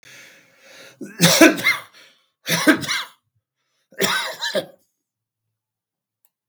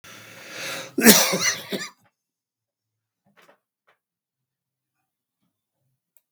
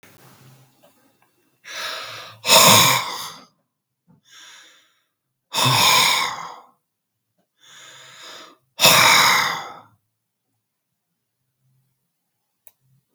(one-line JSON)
{"three_cough_length": "6.5 s", "three_cough_amplitude": 32768, "three_cough_signal_mean_std_ratio": 0.35, "cough_length": "6.3 s", "cough_amplitude": 32768, "cough_signal_mean_std_ratio": 0.24, "exhalation_length": "13.1 s", "exhalation_amplitude": 32768, "exhalation_signal_mean_std_ratio": 0.35, "survey_phase": "beta (2021-08-13 to 2022-03-07)", "age": "65+", "gender": "Male", "wearing_mask": "No", "symptom_none": true, "smoker_status": "Ex-smoker", "respiratory_condition_asthma": false, "respiratory_condition_other": false, "recruitment_source": "REACT", "submission_delay": "2 days", "covid_test_result": "Negative", "covid_test_method": "RT-qPCR", "influenza_a_test_result": "Negative", "influenza_b_test_result": "Negative"}